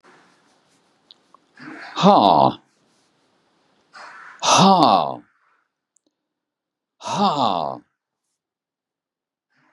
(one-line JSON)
{"exhalation_length": "9.7 s", "exhalation_amplitude": 32767, "exhalation_signal_mean_std_ratio": 0.33, "survey_phase": "beta (2021-08-13 to 2022-03-07)", "age": "65+", "gender": "Male", "wearing_mask": "No", "symptom_none": true, "smoker_status": "Never smoked", "respiratory_condition_asthma": false, "respiratory_condition_other": false, "recruitment_source": "REACT", "submission_delay": "2 days", "covid_test_result": "Negative", "covid_test_method": "RT-qPCR", "influenza_a_test_result": "Negative", "influenza_b_test_result": "Negative"}